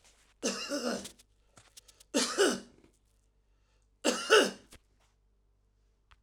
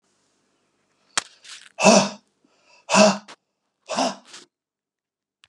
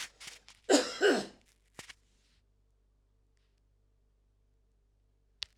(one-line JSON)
{"three_cough_length": "6.2 s", "three_cough_amplitude": 14158, "three_cough_signal_mean_std_ratio": 0.34, "exhalation_length": "5.5 s", "exhalation_amplitude": 32665, "exhalation_signal_mean_std_ratio": 0.29, "cough_length": "5.6 s", "cough_amplitude": 10448, "cough_signal_mean_std_ratio": 0.24, "survey_phase": "alpha (2021-03-01 to 2021-08-12)", "age": "45-64", "gender": "Male", "wearing_mask": "No", "symptom_none": true, "smoker_status": "Never smoked", "respiratory_condition_asthma": false, "respiratory_condition_other": false, "recruitment_source": "REACT", "submission_delay": "1 day", "covid_test_result": "Negative", "covid_test_method": "RT-qPCR"}